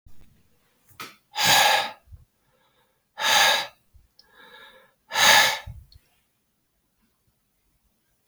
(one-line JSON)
{"exhalation_length": "8.3 s", "exhalation_amplitude": 23147, "exhalation_signal_mean_std_ratio": 0.34, "survey_phase": "beta (2021-08-13 to 2022-03-07)", "age": "65+", "gender": "Male", "wearing_mask": "No", "symptom_none": true, "smoker_status": "Never smoked", "respiratory_condition_asthma": false, "respiratory_condition_other": false, "recruitment_source": "REACT", "submission_delay": "2 days", "covid_test_result": "Negative", "covid_test_method": "RT-qPCR", "influenza_a_test_result": "Negative", "influenza_b_test_result": "Negative"}